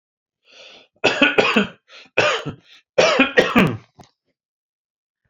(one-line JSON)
{"three_cough_length": "5.3 s", "three_cough_amplitude": 28755, "three_cough_signal_mean_std_ratio": 0.43, "survey_phase": "beta (2021-08-13 to 2022-03-07)", "age": "45-64", "gender": "Male", "wearing_mask": "No", "symptom_runny_or_blocked_nose": true, "symptom_sore_throat": true, "symptom_headache": true, "symptom_other": true, "smoker_status": "Never smoked", "respiratory_condition_asthma": false, "respiratory_condition_other": false, "recruitment_source": "Test and Trace", "submission_delay": "1 day", "covid_test_result": "Positive", "covid_test_method": "ePCR"}